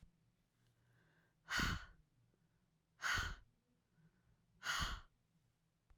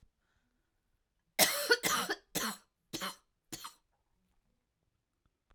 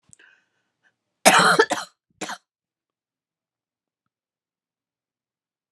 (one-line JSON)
{"exhalation_length": "6.0 s", "exhalation_amplitude": 1444, "exhalation_signal_mean_std_ratio": 0.36, "three_cough_length": "5.5 s", "three_cough_amplitude": 9259, "three_cough_signal_mean_std_ratio": 0.31, "cough_length": "5.7 s", "cough_amplitude": 31238, "cough_signal_mean_std_ratio": 0.23, "survey_phase": "alpha (2021-03-01 to 2021-08-12)", "age": "45-64", "gender": "Female", "wearing_mask": "No", "symptom_cough_any": true, "symptom_shortness_of_breath": true, "symptom_fatigue": true, "symptom_fever_high_temperature": true, "symptom_headache": true, "smoker_status": "Never smoked", "respiratory_condition_asthma": false, "respiratory_condition_other": false, "recruitment_source": "Test and Trace", "submission_delay": "2 days", "covid_test_result": "Positive", "covid_test_method": "RT-qPCR"}